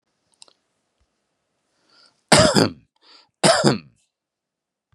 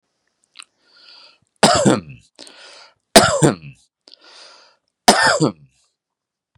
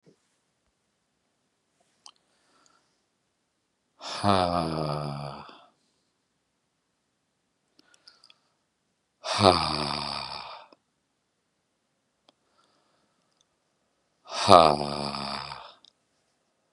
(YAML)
cough_length: 4.9 s
cough_amplitude: 32767
cough_signal_mean_std_ratio: 0.29
three_cough_length: 6.6 s
three_cough_amplitude: 32768
three_cough_signal_mean_std_ratio: 0.32
exhalation_length: 16.7 s
exhalation_amplitude: 32767
exhalation_signal_mean_std_ratio: 0.25
survey_phase: beta (2021-08-13 to 2022-03-07)
age: 45-64
gender: Male
wearing_mask: 'No'
symptom_fatigue: true
smoker_status: Current smoker (e-cigarettes or vapes only)
respiratory_condition_asthma: false
respiratory_condition_other: false
recruitment_source: REACT
submission_delay: 0 days
covid_test_result: Negative
covid_test_method: RT-qPCR
influenza_a_test_result: Negative
influenza_b_test_result: Negative